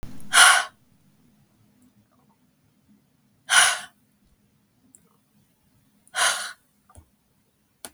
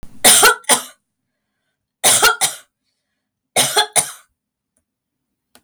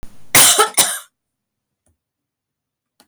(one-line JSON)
{"exhalation_length": "7.9 s", "exhalation_amplitude": 32766, "exhalation_signal_mean_std_ratio": 0.26, "three_cough_length": "5.6 s", "three_cough_amplitude": 32768, "three_cough_signal_mean_std_ratio": 0.38, "cough_length": "3.1 s", "cough_amplitude": 32768, "cough_signal_mean_std_ratio": 0.35, "survey_phase": "beta (2021-08-13 to 2022-03-07)", "age": "65+", "gender": "Female", "wearing_mask": "No", "symptom_none": true, "symptom_onset": "13 days", "smoker_status": "Never smoked", "respiratory_condition_asthma": false, "respiratory_condition_other": false, "recruitment_source": "REACT", "submission_delay": "3 days", "covid_test_result": "Negative", "covid_test_method": "RT-qPCR", "covid_ct_value": 39.0, "covid_ct_gene": "N gene", "influenza_a_test_result": "Negative", "influenza_b_test_result": "Negative"}